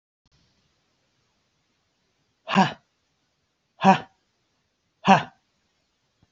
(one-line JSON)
{"exhalation_length": "6.3 s", "exhalation_amplitude": 27203, "exhalation_signal_mean_std_ratio": 0.2, "survey_phase": "beta (2021-08-13 to 2022-03-07)", "age": "65+", "gender": "Male", "wearing_mask": "No", "symptom_none": true, "smoker_status": "Ex-smoker", "respiratory_condition_asthma": false, "respiratory_condition_other": false, "recruitment_source": "REACT", "submission_delay": "1 day", "covid_test_result": "Negative", "covid_test_method": "RT-qPCR", "influenza_a_test_result": "Negative", "influenza_b_test_result": "Negative"}